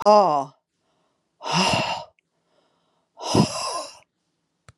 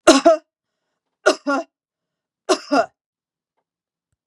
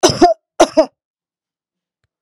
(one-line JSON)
{"exhalation_length": "4.8 s", "exhalation_amplitude": 21201, "exhalation_signal_mean_std_ratio": 0.4, "three_cough_length": "4.3 s", "three_cough_amplitude": 32768, "three_cough_signal_mean_std_ratio": 0.3, "cough_length": "2.2 s", "cough_amplitude": 32768, "cough_signal_mean_std_ratio": 0.33, "survey_phase": "beta (2021-08-13 to 2022-03-07)", "age": "45-64", "gender": "Female", "wearing_mask": "No", "symptom_none": true, "smoker_status": "Never smoked", "respiratory_condition_asthma": false, "respiratory_condition_other": false, "recruitment_source": "REACT", "submission_delay": "2 days", "covid_test_result": "Negative", "covid_test_method": "RT-qPCR", "influenza_a_test_result": "Negative", "influenza_b_test_result": "Negative"}